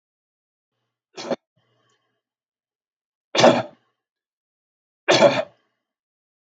{"three_cough_length": "6.5 s", "three_cough_amplitude": 27795, "three_cough_signal_mean_std_ratio": 0.24, "survey_phase": "beta (2021-08-13 to 2022-03-07)", "age": "45-64", "gender": "Male", "wearing_mask": "No", "symptom_none": true, "smoker_status": "Never smoked", "respiratory_condition_asthma": false, "respiratory_condition_other": false, "recruitment_source": "REACT", "submission_delay": "1 day", "covid_test_result": "Negative", "covid_test_method": "RT-qPCR", "influenza_a_test_result": "Negative", "influenza_b_test_result": "Negative"}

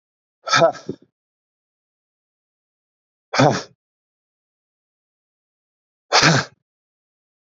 {"exhalation_length": "7.4 s", "exhalation_amplitude": 29104, "exhalation_signal_mean_std_ratio": 0.26, "survey_phase": "beta (2021-08-13 to 2022-03-07)", "age": "45-64", "gender": "Male", "wearing_mask": "No", "symptom_cough_any": true, "symptom_runny_or_blocked_nose": true, "symptom_headache": true, "symptom_onset": "2 days", "smoker_status": "Ex-smoker", "respiratory_condition_asthma": false, "respiratory_condition_other": false, "recruitment_source": "Test and Trace", "submission_delay": "1 day", "covid_test_result": "Positive", "covid_test_method": "RT-qPCR", "covid_ct_value": 17.4, "covid_ct_gene": "ORF1ab gene", "covid_ct_mean": 17.7, "covid_viral_load": "1600000 copies/ml", "covid_viral_load_category": "High viral load (>1M copies/ml)"}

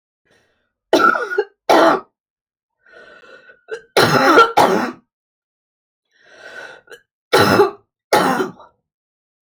{"three_cough_length": "9.6 s", "three_cough_amplitude": 31958, "three_cough_signal_mean_std_ratio": 0.41, "survey_phase": "alpha (2021-03-01 to 2021-08-12)", "age": "45-64", "gender": "Female", "wearing_mask": "No", "symptom_none": true, "smoker_status": "Never smoked", "respiratory_condition_asthma": true, "respiratory_condition_other": false, "recruitment_source": "REACT", "submission_delay": "2 days", "covid_test_result": "Negative", "covid_test_method": "RT-qPCR"}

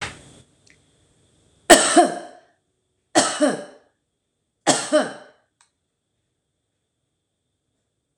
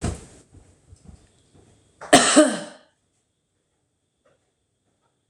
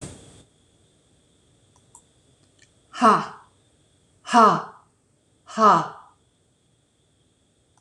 {"three_cough_length": "8.2 s", "three_cough_amplitude": 26028, "three_cough_signal_mean_std_ratio": 0.28, "cough_length": "5.3 s", "cough_amplitude": 26028, "cough_signal_mean_std_ratio": 0.24, "exhalation_length": "7.8 s", "exhalation_amplitude": 25099, "exhalation_signal_mean_std_ratio": 0.27, "survey_phase": "beta (2021-08-13 to 2022-03-07)", "age": "45-64", "gender": "Female", "wearing_mask": "No", "symptom_none": true, "smoker_status": "Ex-smoker", "respiratory_condition_asthma": false, "respiratory_condition_other": false, "recruitment_source": "REACT", "submission_delay": "1 day", "covid_test_result": "Negative", "covid_test_method": "RT-qPCR", "influenza_a_test_result": "Negative", "influenza_b_test_result": "Negative"}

